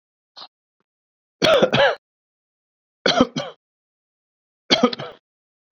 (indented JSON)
{
  "three_cough_length": "5.7 s",
  "three_cough_amplitude": 32767,
  "three_cough_signal_mean_std_ratio": 0.32,
  "survey_phase": "beta (2021-08-13 to 2022-03-07)",
  "age": "18-44",
  "gender": "Male",
  "wearing_mask": "No",
  "symptom_sore_throat": true,
  "symptom_onset": "6 days",
  "smoker_status": "Never smoked",
  "respiratory_condition_asthma": false,
  "respiratory_condition_other": false,
  "recruitment_source": "REACT",
  "submission_delay": "2 days",
  "covid_test_result": "Negative",
  "covid_test_method": "RT-qPCR"
}